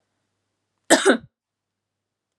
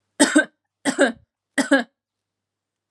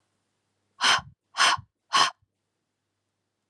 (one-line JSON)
{"cough_length": "2.4 s", "cough_amplitude": 32767, "cough_signal_mean_std_ratio": 0.24, "three_cough_length": "2.9 s", "three_cough_amplitude": 29976, "three_cough_signal_mean_std_ratio": 0.35, "exhalation_length": "3.5 s", "exhalation_amplitude": 16670, "exhalation_signal_mean_std_ratio": 0.32, "survey_phase": "alpha (2021-03-01 to 2021-08-12)", "age": "18-44", "gender": "Female", "wearing_mask": "No", "symptom_none": true, "smoker_status": "Never smoked", "respiratory_condition_asthma": false, "respiratory_condition_other": false, "recruitment_source": "Test and Trace", "submission_delay": "0 days", "covid_test_result": "Negative", "covid_test_method": "LFT"}